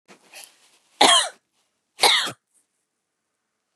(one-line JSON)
{"cough_length": "3.8 s", "cough_amplitude": 31543, "cough_signal_mean_std_ratio": 0.3, "survey_phase": "beta (2021-08-13 to 2022-03-07)", "age": "45-64", "gender": "Female", "wearing_mask": "No", "symptom_fatigue": true, "symptom_headache": true, "symptom_onset": "13 days", "smoker_status": "Never smoked", "respiratory_condition_asthma": false, "respiratory_condition_other": false, "recruitment_source": "REACT", "submission_delay": "1 day", "covid_test_result": "Negative", "covid_test_method": "RT-qPCR", "influenza_a_test_result": "Unknown/Void", "influenza_b_test_result": "Unknown/Void"}